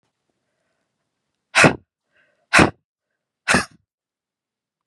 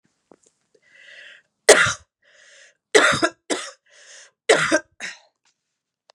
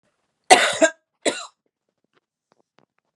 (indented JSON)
{
  "exhalation_length": "4.9 s",
  "exhalation_amplitude": 32736,
  "exhalation_signal_mean_std_ratio": 0.23,
  "three_cough_length": "6.1 s",
  "three_cough_amplitude": 32768,
  "three_cough_signal_mean_std_ratio": 0.3,
  "cough_length": "3.2 s",
  "cough_amplitude": 32768,
  "cough_signal_mean_std_ratio": 0.25,
  "survey_phase": "beta (2021-08-13 to 2022-03-07)",
  "age": "45-64",
  "gender": "Female",
  "wearing_mask": "No",
  "symptom_cough_any": true,
  "symptom_new_continuous_cough": true,
  "symptom_runny_or_blocked_nose": true,
  "symptom_fatigue": true,
  "symptom_fever_high_temperature": true,
  "symptom_headache": true,
  "symptom_other": true,
  "smoker_status": "Prefer not to say",
  "respiratory_condition_asthma": false,
  "respiratory_condition_other": false,
  "recruitment_source": "Test and Trace",
  "submission_delay": "2 days",
  "covid_test_result": "Positive",
  "covid_test_method": "LFT"
}